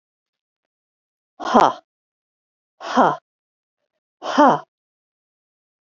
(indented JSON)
{
  "exhalation_length": "5.8 s",
  "exhalation_amplitude": 32767,
  "exhalation_signal_mean_std_ratio": 0.26,
  "survey_phase": "beta (2021-08-13 to 2022-03-07)",
  "age": "45-64",
  "gender": "Female",
  "wearing_mask": "No",
  "symptom_none": true,
  "smoker_status": "Never smoked",
  "respiratory_condition_asthma": false,
  "respiratory_condition_other": false,
  "recruitment_source": "REACT",
  "submission_delay": "1 day",
  "covid_test_result": "Negative",
  "covid_test_method": "RT-qPCR"
}